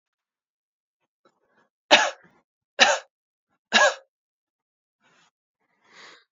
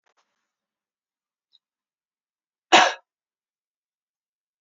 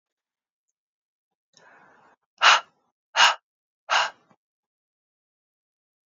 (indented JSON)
{
  "three_cough_length": "6.3 s",
  "three_cough_amplitude": 30233,
  "three_cough_signal_mean_std_ratio": 0.22,
  "cough_length": "4.6 s",
  "cough_amplitude": 27313,
  "cough_signal_mean_std_ratio": 0.15,
  "exhalation_length": "6.1 s",
  "exhalation_amplitude": 25161,
  "exhalation_signal_mean_std_ratio": 0.22,
  "survey_phase": "beta (2021-08-13 to 2022-03-07)",
  "age": "18-44",
  "gender": "Female",
  "wearing_mask": "No",
  "symptom_runny_or_blocked_nose": true,
  "symptom_headache": true,
  "smoker_status": "Never smoked",
  "respiratory_condition_asthma": false,
  "respiratory_condition_other": false,
  "recruitment_source": "Test and Trace",
  "submission_delay": "2 days",
  "covid_test_result": "Positive",
  "covid_test_method": "RT-qPCR",
  "covid_ct_value": 20.4,
  "covid_ct_gene": "S gene"
}